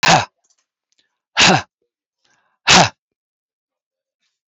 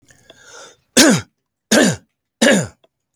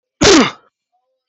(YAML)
exhalation_length: 4.5 s
exhalation_amplitude: 32768
exhalation_signal_mean_std_ratio: 0.3
three_cough_length: 3.2 s
three_cough_amplitude: 32768
three_cough_signal_mean_std_ratio: 0.4
cough_length: 1.3 s
cough_amplitude: 32768
cough_signal_mean_std_ratio: 0.41
survey_phase: beta (2021-08-13 to 2022-03-07)
age: 45-64
gender: Male
wearing_mask: 'No'
symptom_cough_any: true
symptom_sore_throat: true
symptom_headache: true
smoker_status: Never smoked
respiratory_condition_asthma: true
respiratory_condition_other: false
recruitment_source: REACT
submission_delay: 3 days
covid_test_result: Negative
covid_test_method: RT-qPCR